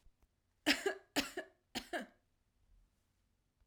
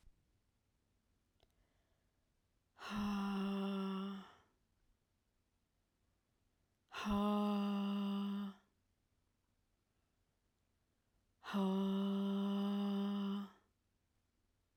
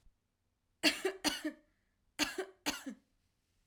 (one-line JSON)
{"three_cough_length": "3.7 s", "three_cough_amplitude": 5162, "three_cough_signal_mean_std_ratio": 0.3, "exhalation_length": "14.8 s", "exhalation_amplitude": 1526, "exhalation_signal_mean_std_ratio": 0.55, "cough_length": "3.7 s", "cough_amplitude": 6645, "cough_signal_mean_std_ratio": 0.35, "survey_phase": "alpha (2021-03-01 to 2021-08-12)", "age": "45-64", "gender": "Female", "wearing_mask": "No", "symptom_cough_any": true, "symptom_fatigue": true, "symptom_onset": "3 days", "smoker_status": "Prefer not to say", "respiratory_condition_asthma": false, "respiratory_condition_other": false, "recruitment_source": "Test and Trace", "submission_delay": "2 days", "covid_test_result": "Positive", "covid_test_method": "RT-qPCR"}